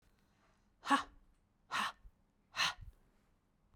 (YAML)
exhalation_length: 3.8 s
exhalation_amplitude: 4351
exhalation_signal_mean_std_ratio: 0.31
survey_phase: beta (2021-08-13 to 2022-03-07)
age: 45-64
gender: Female
wearing_mask: 'No'
symptom_cough_any: true
symptom_new_continuous_cough: true
symptom_runny_or_blocked_nose: true
symptom_sore_throat: true
symptom_fatigue: true
symptom_headache: true
symptom_onset: 2 days
smoker_status: Ex-smoker
respiratory_condition_asthma: false
respiratory_condition_other: false
recruitment_source: Test and Trace
submission_delay: 1 day
covid_test_result: Positive
covid_test_method: ePCR